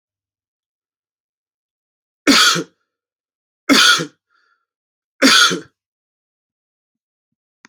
{"three_cough_length": "7.7 s", "three_cough_amplitude": 32768, "three_cough_signal_mean_std_ratio": 0.3, "survey_phase": "beta (2021-08-13 to 2022-03-07)", "age": "18-44", "gender": "Male", "wearing_mask": "No", "symptom_none": true, "smoker_status": "Never smoked", "respiratory_condition_asthma": false, "respiratory_condition_other": false, "recruitment_source": "REACT", "submission_delay": "1 day", "covid_test_result": "Negative", "covid_test_method": "RT-qPCR"}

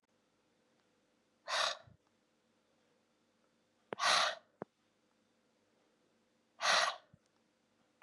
{"exhalation_length": "8.0 s", "exhalation_amplitude": 4999, "exhalation_signal_mean_std_ratio": 0.28, "survey_phase": "beta (2021-08-13 to 2022-03-07)", "age": "45-64", "gender": "Female", "wearing_mask": "No", "symptom_cough_any": true, "symptom_runny_or_blocked_nose": true, "symptom_sore_throat": true, "symptom_abdominal_pain": true, "symptom_diarrhoea": true, "symptom_fatigue": true, "symptom_fever_high_temperature": true, "symptom_headache": true, "symptom_loss_of_taste": true, "smoker_status": "Never smoked", "respiratory_condition_asthma": false, "respiratory_condition_other": false, "recruitment_source": "REACT", "submission_delay": "7 days", "covid_test_result": "Negative", "covid_test_method": "RT-qPCR", "influenza_a_test_result": "Negative", "influenza_b_test_result": "Negative"}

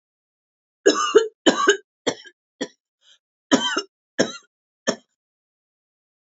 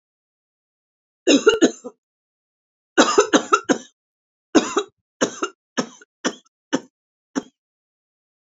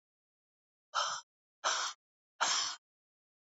{"cough_length": "6.2 s", "cough_amplitude": 27317, "cough_signal_mean_std_ratio": 0.31, "three_cough_length": "8.5 s", "three_cough_amplitude": 28963, "three_cough_signal_mean_std_ratio": 0.3, "exhalation_length": "3.5 s", "exhalation_amplitude": 5228, "exhalation_signal_mean_std_ratio": 0.4, "survey_phase": "beta (2021-08-13 to 2022-03-07)", "age": "65+", "gender": "Female", "wearing_mask": "No", "symptom_cough_any": true, "symptom_runny_or_blocked_nose": true, "symptom_sore_throat": true, "symptom_onset": "9 days", "smoker_status": "Never smoked", "respiratory_condition_asthma": false, "respiratory_condition_other": false, "recruitment_source": "REACT", "submission_delay": "1 day", "covid_test_result": "Negative", "covid_test_method": "RT-qPCR", "influenza_a_test_result": "Negative", "influenza_b_test_result": "Negative"}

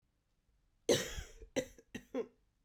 {"cough_length": "2.6 s", "cough_amplitude": 4711, "cough_signal_mean_std_ratio": 0.33, "survey_phase": "beta (2021-08-13 to 2022-03-07)", "age": "18-44", "gender": "Female", "wearing_mask": "No", "symptom_cough_any": true, "symptom_runny_or_blocked_nose": true, "symptom_fatigue": true, "symptom_headache": true, "symptom_change_to_sense_of_smell_or_taste": true, "symptom_loss_of_taste": true, "symptom_onset": "3 days", "smoker_status": "Never smoked", "respiratory_condition_asthma": false, "respiratory_condition_other": false, "recruitment_source": "Test and Trace", "submission_delay": "2 days", "covid_test_result": "Positive", "covid_test_method": "ePCR"}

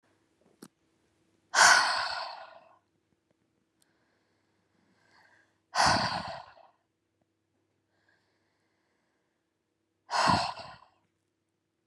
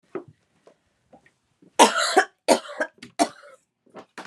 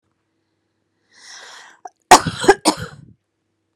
{"exhalation_length": "11.9 s", "exhalation_amplitude": 15296, "exhalation_signal_mean_std_ratio": 0.28, "three_cough_length": "4.3 s", "three_cough_amplitude": 30042, "three_cough_signal_mean_std_ratio": 0.3, "cough_length": "3.8 s", "cough_amplitude": 32768, "cough_signal_mean_std_ratio": 0.23, "survey_phase": "beta (2021-08-13 to 2022-03-07)", "age": "18-44", "gender": "Female", "wearing_mask": "No", "symptom_fatigue": true, "symptom_onset": "5 days", "smoker_status": "Ex-smoker", "respiratory_condition_asthma": false, "respiratory_condition_other": false, "recruitment_source": "REACT", "submission_delay": "1 day", "covid_test_result": "Negative", "covid_test_method": "RT-qPCR"}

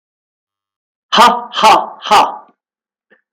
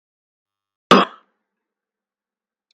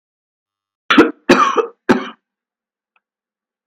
{"exhalation_length": "3.3 s", "exhalation_amplitude": 32768, "exhalation_signal_mean_std_ratio": 0.43, "cough_length": "2.7 s", "cough_amplitude": 32768, "cough_signal_mean_std_ratio": 0.17, "three_cough_length": "3.7 s", "three_cough_amplitude": 32768, "three_cough_signal_mean_std_ratio": 0.32, "survey_phase": "beta (2021-08-13 to 2022-03-07)", "age": "65+", "gender": "Female", "wearing_mask": "No", "symptom_none": true, "smoker_status": "Ex-smoker", "respiratory_condition_asthma": false, "respiratory_condition_other": false, "recruitment_source": "REACT", "submission_delay": "3 days", "covid_test_result": "Negative", "covid_test_method": "RT-qPCR", "influenza_a_test_result": "Negative", "influenza_b_test_result": "Negative"}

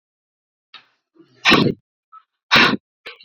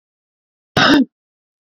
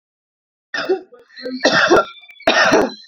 {"exhalation_length": "3.2 s", "exhalation_amplitude": 29268, "exhalation_signal_mean_std_ratio": 0.32, "cough_length": "1.6 s", "cough_amplitude": 29803, "cough_signal_mean_std_ratio": 0.35, "three_cough_length": "3.1 s", "three_cough_amplitude": 30596, "three_cough_signal_mean_std_ratio": 0.53, "survey_phase": "beta (2021-08-13 to 2022-03-07)", "age": "18-44", "gender": "Female", "wearing_mask": "No", "symptom_cough_any": true, "symptom_runny_or_blocked_nose": true, "symptom_sore_throat": true, "symptom_fatigue": true, "symptom_other": true, "symptom_onset": "3 days", "smoker_status": "Ex-smoker", "respiratory_condition_asthma": false, "respiratory_condition_other": false, "recruitment_source": "Test and Trace", "submission_delay": "2 days", "covid_test_result": "Positive", "covid_test_method": "RT-qPCR", "covid_ct_value": 22.9, "covid_ct_gene": "ORF1ab gene", "covid_ct_mean": 23.5, "covid_viral_load": "20000 copies/ml", "covid_viral_load_category": "Low viral load (10K-1M copies/ml)"}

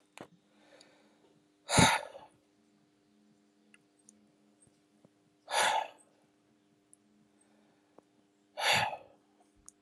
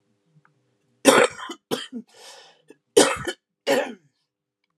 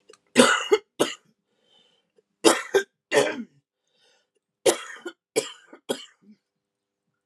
{"exhalation_length": "9.8 s", "exhalation_amplitude": 10528, "exhalation_signal_mean_std_ratio": 0.26, "cough_length": "4.8 s", "cough_amplitude": 32610, "cough_signal_mean_std_ratio": 0.31, "three_cough_length": "7.3 s", "three_cough_amplitude": 30430, "three_cough_signal_mean_std_ratio": 0.31, "survey_phase": "alpha (2021-03-01 to 2021-08-12)", "age": "45-64", "gender": "Female", "wearing_mask": "No", "symptom_cough_any": true, "symptom_fatigue": true, "symptom_headache": true, "symptom_onset": "4 days", "smoker_status": "Ex-smoker", "respiratory_condition_asthma": false, "respiratory_condition_other": false, "recruitment_source": "Test and Trace", "submission_delay": "2 days", "covid_test_result": "Positive", "covid_test_method": "RT-qPCR", "covid_ct_value": 12.8, "covid_ct_gene": "N gene", "covid_ct_mean": 13.3, "covid_viral_load": "44000000 copies/ml", "covid_viral_load_category": "High viral load (>1M copies/ml)"}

